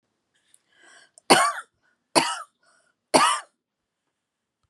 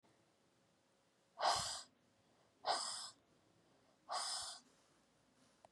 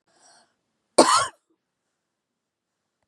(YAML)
three_cough_length: 4.7 s
three_cough_amplitude: 32589
three_cough_signal_mean_std_ratio: 0.29
exhalation_length: 5.7 s
exhalation_amplitude: 2254
exhalation_signal_mean_std_ratio: 0.38
cough_length: 3.1 s
cough_amplitude: 30868
cough_signal_mean_std_ratio: 0.22
survey_phase: beta (2021-08-13 to 2022-03-07)
age: 45-64
gender: Female
wearing_mask: 'No'
symptom_none: true
smoker_status: Never smoked
respiratory_condition_asthma: false
respiratory_condition_other: false
recruitment_source: REACT
submission_delay: 1 day
covid_test_result: Negative
covid_test_method: RT-qPCR